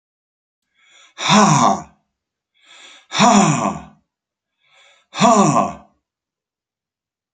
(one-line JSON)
{"exhalation_length": "7.3 s", "exhalation_amplitude": 29950, "exhalation_signal_mean_std_ratio": 0.4, "survey_phase": "beta (2021-08-13 to 2022-03-07)", "age": "65+", "gender": "Male", "wearing_mask": "No", "symptom_none": true, "smoker_status": "Never smoked", "respiratory_condition_asthma": false, "respiratory_condition_other": false, "recruitment_source": "REACT", "submission_delay": "2 days", "covid_test_result": "Negative", "covid_test_method": "RT-qPCR"}